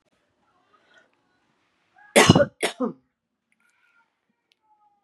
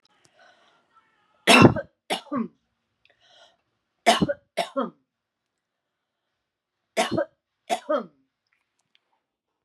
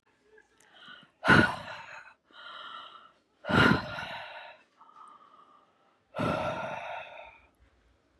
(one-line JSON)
{"cough_length": "5.0 s", "cough_amplitude": 32768, "cough_signal_mean_std_ratio": 0.21, "three_cough_length": "9.6 s", "three_cough_amplitude": 30859, "three_cough_signal_mean_std_ratio": 0.25, "exhalation_length": "8.2 s", "exhalation_amplitude": 13958, "exhalation_signal_mean_std_ratio": 0.35, "survey_phase": "beta (2021-08-13 to 2022-03-07)", "age": "45-64", "gender": "Female", "wearing_mask": "No", "symptom_none": true, "smoker_status": "Never smoked", "respiratory_condition_asthma": false, "respiratory_condition_other": false, "recruitment_source": "REACT", "submission_delay": "2 days", "covid_test_result": "Negative", "covid_test_method": "RT-qPCR", "influenza_a_test_result": "Negative", "influenza_b_test_result": "Negative"}